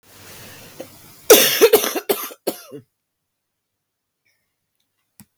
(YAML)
cough_length: 5.4 s
cough_amplitude: 32768
cough_signal_mean_std_ratio: 0.29
survey_phase: beta (2021-08-13 to 2022-03-07)
age: 45-64
gender: Female
wearing_mask: 'No'
symptom_cough_any: true
symptom_new_continuous_cough: true
symptom_runny_or_blocked_nose: true
symptom_shortness_of_breath: true
symptom_sore_throat: true
symptom_abdominal_pain: true
symptom_diarrhoea: true
symptom_fatigue: true
symptom_fever_high_temperature: true
symptom_onset: 17 days
smoker_status: Never smoked
respiratory_condition_asthma: false
respiratory_condition_other: false
recruitment_source: Test and Trace
submission_delay: 15 days
covid_test_result: Negative
covid_test_method: RT-qPCR